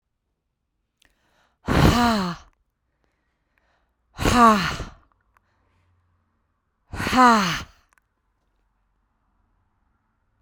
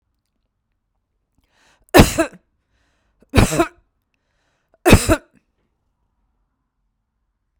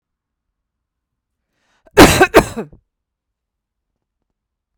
{"exhalation_length": "10.4 s", "exhalation_amplitude": 32768, "exhalation_signal_mean_std_ratio": 0.32, "three_cough_length": "7.6 s", "three_cough_amplitude": 32768, "three_cough_signal_mean_std_ratio": 0.23, "cough_length": "4.8 s", "cough_amplitude": 32768, "cough_signal_mean_std_ratio": 0.22, "survey_phase": "beta (2021-08-13 to 2022-03-07)", "age": "65+", "gender": "Female", "wearing_mask": "No", "symptom_none": true, "smoker_status": "Never smoked", "respiratory_condition_asthma": false, "respiratory_condition_other": false, "recruitment_source": "REACT", "submission_delay": "1 day", "covid_test_result": "Negative", "covid_test_method": "RT-qPCR", "influenza_a_test_result": "Negative", "influenza_b_test_result": "Negative"}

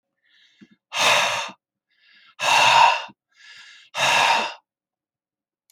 {"exhalation_length": "5.7 s", "exhalation_amplitude": 21527, "exhalation_signal_mean_std_ratio": 0.45, "survey_phase": "alpha (2021-03-01 to 2021-08-12)", "age": "65+", "gender": "Male", "wearing_mask": "No", "symptom_none": true, "smoker_status": "Never smoked", "respiratory_condition_asthma": false, "respiratory_condition_other": false, "recruitment_source": "REACT", "submission_delay": "6 days", "covid_test_result": "Negative", "covid_test_method": "RT-qPCR"}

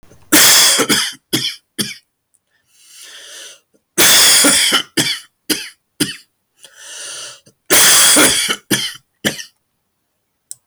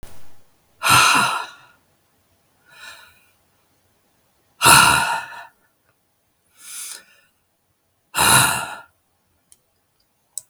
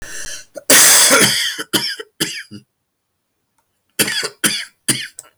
{"three_cough_length": "10.7 s", "three_cough_amplitude": 32768, "three_cough_signal_mean_std_ratio": 0.52, "exhalation_length": "10.5 s", "exhalation_amplitude": 32768, "exhalation_signal_mean_std_ratio": 0.34, "cough_length": "5.4 s", "cough_amplitude": 32768, "cough_signal_mean_std_ratio": 0.49, "survey_phase": "beta (2021-08-13 to 2022-03-07)", "age": "65+", "gender": "Male", "wearing_mask": "No", "symptom_cough_any": true, "symptom_new_continuous_cough": true, "symptom_sore_throat": true, "symptom_fatigue": true, "symptom_headache": true, "smoker_status": "Never smoked", "respiratory_condition_asthma": false, "respiratory_condition_other": false, "recruitment_source": "Test and Trace", "submission_delay": "2 days", "covid_test_result": "Positive", "covid_test_method": "RT-qPCR", "covid_ct_value": 26.4, "covid_ct_gene": "ORF1ab gene", "covid_ct_mean": 26.5, "covid_viral_load": "2100 copies/ml", "covid_viral_load_category": "Minimal viral load (< 10K copies/ml)"}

